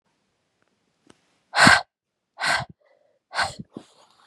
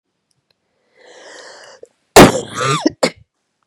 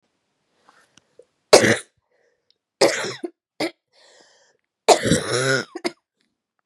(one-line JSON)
{"exhalation_length": "4.3 s", "exhalation_amplitude": 32577, "exhalation_signal_mean_std_ratio": 0.27, "cough_length": "3.7 s", "cough_amplitude": 32768, "cough_signal_mean_std_ratio": 0.29, "three_cough_length": "6.7 s", "three_cough_amplitude": 32768, "three_cough_signal_mean_std_ratio": 0.31, "survey_phase": "beta (2021-08-13 to 2022-03-07)", "age": "18-44", "gender": "Female", "wearing_mask": "No", "symptom_cough_any": true, "symptom_runny_or_blocked_nose": true, "symptom_fatigue": true, "symptom_headache": true, "symptom_change_to_sense_of_smell_or_taste": true, "symptom_loss_of_taste": true, "symptom_onset": "3 days", "smoker_status": "Ex-smoker", "respiratory_condition_asthma": true, "respiratory_condition_other": false, "recruitment_source": "Test and Trace", "submission_delay": "2 days", "covid_test_result": "Positive", "covid_test_method": "RT-qPCR", "covid_ct_value": 15.9, "covid_ct_gene": "ORF1ab gene", "covid_ct_mean": 16.4, "covid_viral_load": "4100000 copies/ml", "covid_viral_load_category": "High viral load (>1M copies/ml)"}